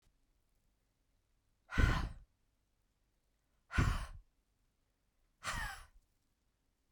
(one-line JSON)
{"exhalation_length": "6.9 s", "exhalation_amplitude": 4335, "exhalation_signal_mean_std_ratio": 0.28, "survey_phase": "beta (2021-08-13 to 2022-03-07)", "age": "45-64", "gender": "Female", "wearing_mask": "No", "symptom_none": true, "smoker_status": "Never smoked", "respiratory_condition_asthma": false, "respiratory_condition_other": false, "recruitment_source": "REACT", "submission_delay": "2 days", "covid_test_result": "Negative", "covid_test_method": "RT-qPCR", "influenza_a_test_result": "Unknown/Void", "influenza_b_test_result": "Unknown/Void"}